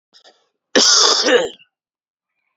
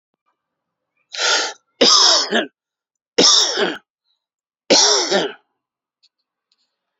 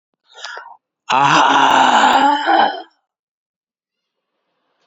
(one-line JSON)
{"cough_length": "2.6 s", "cough_amplitude": 32768, "cough_signal_mean_std_ratio": 0.45, "three_cough_length": "7.0 s", "three_cough_amplitude": 32768, "three_cough_signal_mean_std_ratio": 0.43, "exhalation_length": "4.9 s", "exhalation_amplitude": 31235, "exhalation_signal_mean_std_ratio": 0.52, "survey_phase": "beta (2021-08-13 to 2022-03-07)", "age": "65+", "gender": "Male", "wearing_mask": "No", "symptom_cough_any": true, "symptom_runny_or_blocked_nose": true, "symptom_headache": true, "symptom_onset": "4 days", "smoker_status": "Ex-smoker", "respiratory_condition_asthma": false, "respiratory_condition_other": false, "recruitment_source": "Test and Trace", "submission_delay": "1 day", "covid_test_result": "Positive", "covid_test_method": "RT-qPCR", "covid_ct_value": 13.1, "covid_ct_gene": "N gene", "covid_ct_mean": 14.6, "covid_viral_load": "17000000 copies/ml", "covid_viral_load_category": "High viral load (>1M copies/ml)"}